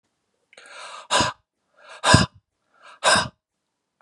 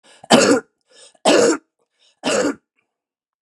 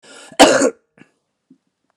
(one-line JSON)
{"exhalation_length": "4.0 s", "exhalation_amplitude": 32768, "exhalation_signal_mean_std_ratio": 0.32, "three_cough_length": "3.4 s", "three_cough_amplitude": 32767, "three_cough_signal_mean_std_ratio": 0.42, "cough_length": "2.0 s", "cough_amplitude": 32768, "cough_signal_mean_std_ratio": 0.31, "survey_phase": "beta (2021-08-13 to 2022-03-07)", "age": "45-64", "gender": "Male", "wearing_mask": "No", "symptom_cough_any": true, "symptom_runny_or_blocked_nose": true, "symptom_other": true, "symptom_onset": "4 days", "smoker_status": "Ex-smoker", "respiratory_condition_asthma": true, "respiratory_condition_other": false, "recruitment_source": "Test and Trace", "submission_delay": "2 days", "covid_test_result": "Positive", "covid_test_method": "RT-qPCR", "covid_ct_value": 12.3, "covid_ct_gene": "ORF1ab gene", "covid_ct_mean": 12.8, "covid_viral_load": "62000000 copies/ml", "covid_viral_load_category": "High viral load (>1M copies/ml)"}